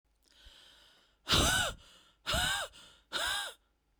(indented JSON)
{
  "exhalation_length": "4.0 s",
  "exhalation_amplitude": 5665,
  "exhalation_signal_mean_std_ratio": 0.47,
  "survey_phase": "beta (2021-08-13 to 2022-03-07)",
  "age": "18-44",
  "gender": "Female",
  "wearing_mask": "No",
  "symptom_none": true,
  "smoker_status": "Ex-smoker",
  "respiratory_condition_asthma": true,
  "respiratory_condition_other": false,
  "recruitment_source": "REACT",
  "submission_delay": "1 day",
  "covid_test_result": "Negative",
  "covid_test_method": "RT-qPCR"
}